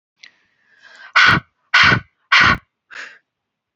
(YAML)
exhalation_length: 3.8 s
exhalation_amplitude: 29422
exhalation_signal_mean_std_ratio: 0.38
survey_phase: alpha (2021-03-01 to 2021-08-12)
age: 45-64
gender: Female
wearing_mask: 'No'
symptom_change_to_sense_of_smell_or_taste: true
symptom_onset: 8 days
smoker_status: Ex-smoker
respiratory_condition_asthma: false
respiratory_condition_other: false
recruitment_source: REACT
submission_delay: 1 day
covid_test_result: Negative
covid_test_method: RT-qPCR